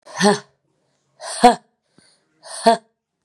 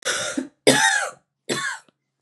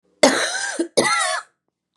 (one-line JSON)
{"exhalation_length": "3.2 s", "exhalation_amplitude": 32768, "exhalation_signal_mean_std_ratio": 0.29, "three_cough_length": "2.2 s", "three_cough_amplitude": 28131, "three_cough_signal_mean_std_ratio": 0.52, "cough_length": "2.0 s", "cough_amplitude": 32767, "cough_signal_mean_std_ratio": 0.56, "survey_phase": "beta (2021-08-13 to 2022-03-07)", "age": "18-44", "gender": "Female", "wearing_mask": "No", "symptom_runny_or_blocked_nose": true, "symptom_fatigue": true, "symptom_headache": true, "symptom_other": true, "symptom_onset": "3 days", "smoker_status": "Never smoked", "respiratory_condition_asthma": false, "respiratory_condition_other": false, "recruitment_source": "Test and Trace", "submission_delay": "1 day", "covid_test_result": "Positive", "covid_test_method": "RT-qPCR", "covid_ct_value": 11.9, "covid_ct_gene": "ORF1ab gene", "covid_ct_mean": 12.2, "covid_viral_load": "96000000 copies/ml", "covid_viral_load_category": "High viral load (>1M copies/ml)"}